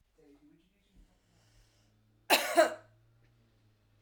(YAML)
cough_length: 4.0 s
cough_amplitude: 9207
cough_signal_mean_std_ratio: 0.24
survey_phase: alpha (2021-03-01 to 2021-08-12)
age: 45-64
gender: Female
wearing_mask: 'No'
symptom_fatigue: true
symptom_headache: true
symptom_change_to_sense_of_smell_or_taste: true
symptom_loss_of_taste: true
smoker_status: Ex-smoker
respiratory_condition_asthma: false
respiratory_condition_other: false
recruitment_source: Test and Trace
submission_delay: 2 days
covid_test_result: Positive
covid_test_method: RT-qPCR
covid_ct_value: 22.6
covid_ct_gene: ORF1ab gene